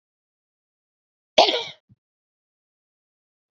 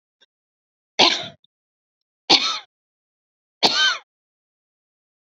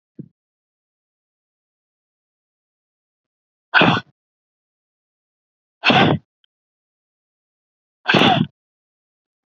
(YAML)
cough_length: 3.6 s
cough_amplitude: 28878
cough_signal_mean_std_ratio: 0.18
three_cough_length: 5.4 s
three_cough_amplitude: 32767
three_cough_signal_mean_std_ratio: 0.29
exhalation_length: 9.5 s
exhalation_amplitude: 31240
exhalation_signal_mean_std_ratio: 0.25
survey_phase: beta (2021-08-13 to 2022-03-07)
age: 45-64
gender: Female
wearing_mask: 'No'
symptom_runny_or_blocked_nose: true
symptom_fatigue: true
symptom_headache: true
symptom_onset: 6 days
smoker_status: Never smoked
respiratory_condition_asthma: true
respiratory_condition_other: false
recruitment_source: REACT
submission_delay: 1 day
covid_test_result: Negative
covid_test_method: RT-qPCR
influenza_a_test_result: Negative
influenza_b_test_result: Negative